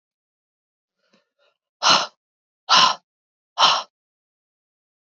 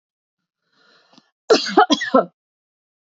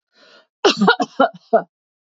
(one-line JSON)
{"exhalation_length": "5.0 s", "exhalation_amplitude": 26329, "exhalation_signal_mean_std_ratio": 0.29, "three_cough_length": "3.1 s", "three_cough_amplitude": 28159, "three_cough_signal_mean_std_ratio": 0.3, "cough_length": "2.1 s", "cough_amplitude": 29414, "cough_signal_mean_std_ratio": 0.39, "survey_phase": "beta (2021-08-13 to 2022-03-07)", "age": "45-64", "gender": "Female", "wearing_mask": "No", "symptom_none": true, "smoker_status": "Never smoked", "respiratory_condition_asthma": false, "respiratory_condition_other": false, "recruitment_source": "REACT", "submission_delay": "2 days", "covid_test_result": "Negative", "covid_test_method": "RT-qPCR", "influenza_a_test_result": "Negative", "influenza_b_test_result": "Negative"}